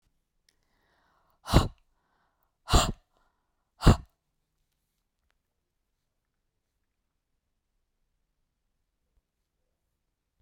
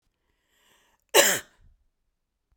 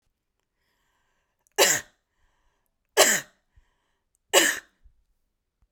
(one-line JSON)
{"exhalation_length": "10.4 s", "exhalation_amplitude": 22811, "exhalation_signal_mean_std_ratio": 0.15, "cough_length": "2.6 s", "cough_amplitude": 23090, "cough_signal_mean_std_ratio": 0.23, "three_cough_length": "5.7 s", "three_cough_amplitude": 27627, "three_cough_signal_mean_std_ratio": 0.26, "survey_phase": "beta (2021-08-13 to 2022-03-07)", "age": "45-64", "gender": "Female", "wearing_mask": "No", "symptom_none": true, "smoker_status": "Never smoked", "respiratory_condition_asthma": false, "respiratory_condition_other": false, "recruitment_source": "REACT", "submission_delay": "1 day", "covid_test_result": "Negative", "covid_test_method": "RT-qPCR"}